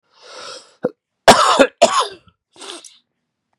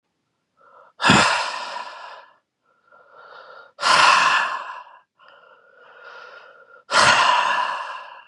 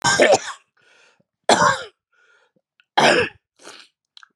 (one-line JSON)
{"cough_length": "3.6 s", "cough_amplitude": 32768, "cough_signal_mean_std_ratio": 0.34, "exhalation_length": "8.3 s", "exhalation_amplitude": 29386, "exhalation_signal_mean_std_ratio": 0.46, "three_cough_length": "4.4 s", "three_cough_amplitude": 31430, "three_cough_signal_mean_std_ratio": 0.39, "survey_phase": "beta (2021-08-13 to 2022-03-07)", "age": "18-44", "gender": "Male", "wearing_mask": "No", "symptom_cough_any": true, "symptom_runny_or_blocked_nose": true, "symptom_shortness_of_breath": true, "symptom_sore_throat": true, "symptom_fatigue": true, "symptom_headache": true, "symptom_onset": "4 days", "smoker_status": "Ex-smoker", "respiratory_condition_asthma": false, "respiratory_condition_other": false, "recruitment_source": "REACT", "submission_delay": "2 days", "covid_test_result": "Negative", "covid_test_method": "RT-qPCR", "influenza_a_test_result": "Negative", "influenza_b_test_result": "Negative"}